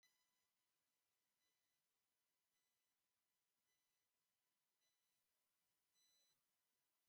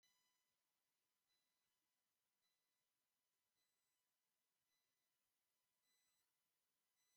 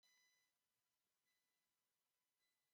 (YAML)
exhalation_length: 7.1 s
exhalation_amplitude: 18
exhalation_signal_mean_std_ratio: 0.63
three_cough_length: 7.2 s
three_cough_amplitude: 12
three_cough_signal_mean_std_ratio: 0.67
cough_length: 2.7 s
cough_amplitude: 12
cough_signal_mean_std_ratio: 0.62
survey_phase: beta (2021-08-13 to 2022-03-07)
age: 45-64
gender: Male
wearing_mask: 'No'
symptom_diarrhoea: true
symptom_onset: 12 days
smoker_status: Never smoked
respiratory_condition_asthma: false
respiratory_condition_other: false
recruitment_source: REACT
submission_delay: 4 days
covid_test_result: Negative
covid_test_method: RT-qPCR
influenza_a_test_result: Negative
influenza_b_test_result: Negative